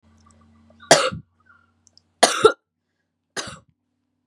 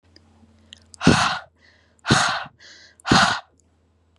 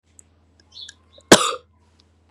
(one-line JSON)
{"three_cough_length": "4.3 s", "three_cough_amplitude": 32767, "three_cough_signal_mean_std_ratio": 0.24, "exhalation_length": "4.2 s", "exhalation_amplitude": 30109, "exhalation_signal_mean_std_ratio": 0.39, "cough_length": "2.3 s", "cough_amplitude": 32768, "cough_signal_mean_std_ratio": 0.2, "survey_phase": "beta (2021-08-13 to 2022-03-07)", "age": "18-44", "gender": "Female", "wearing_mask": "No", "symptom_cough_any": true, "symptom_runny_or_blocked_nose": true, "symptom_sore_throat": true, "smoker_status": "Never smoked", "respiratory_condition_asthma": false, "respiratory_condition_other": false, "recruitment_source": "Test and Trace", "submission_delay": "2 days", "covid_test_result": "Positive", "covid_test_method": "RT-qPCR", "covid_ct_value": 26.2, "covid_ct_gene": "N gene"}